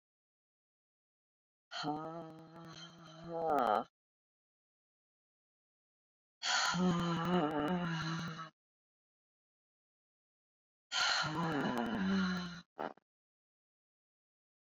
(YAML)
exhalation_length: 14.7 s
exhalation_amplitude: 3519
exhalation_signal_mean_std_ratio: 0.49
survey_phase: beta (2021-08-13 to 2022-03-07)
age: 45-64
gender: Female
wearing_mask: 'No'
symptom_cough_any: true
symptom_new_continuous_cough: true
symptom_runny_or_blocked_nose: true
symptom_sore_throat: true
symptom_fatigue: true
symptom_fever_high_temperature: true
symptom_headache: true
symptom_change_to_sense_of_smell_or_taste: true
symptom_onset: 5 days
smoker_status: Never smoked
respiratory_condition_asthma: false
respiratory_condition_other: false
recruitment_source: Test and Trace
submission_delay: 2 days
covid_test_result: Positive
covid_test_method: RT-qPCR
covid_ct_value: 14.5
covid_ct_gene: ORF1ab gene
covid_ct_mean: 15.0
covid_viral_load: 12000000 copies/ml
covid_viral_load_category: High viral load (>1M copies/ml)